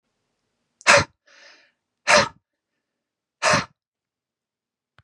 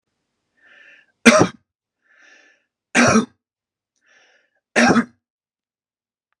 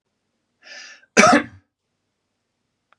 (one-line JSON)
{"exhalation_length": "5.0 s", "exhalation_amplitude": 32705, "exhalation_signal_mean_std_ratio": 0.25, "three_cough_length": "6.4 s", "three_cough_amplitude": 32768, "three_cough_signal_mean_std_ratio": 0.28, "cough_length": "3.0 s", "cough_amplitude": 32768, "cough_signal_mean_std_ratio": 0.24, "survey_phase": "beta (2021-08-13 to 2022-03-07)", "age": "45-64", "gender": "Male", "wearing_mask": "No", "symptom_none": true, "smoker_status": "Ex-smoker", "respiratory_condition_asthma": false, "respiratory_condition_other": false, "recruitment_source": "REACT", "submission_delay": "1 day", "covid_test_result": "Negative", "covid_test_method": "RT-qPCR", "influenza_a_test_result": "Negative", "influenza_b_test_result": "Negative"}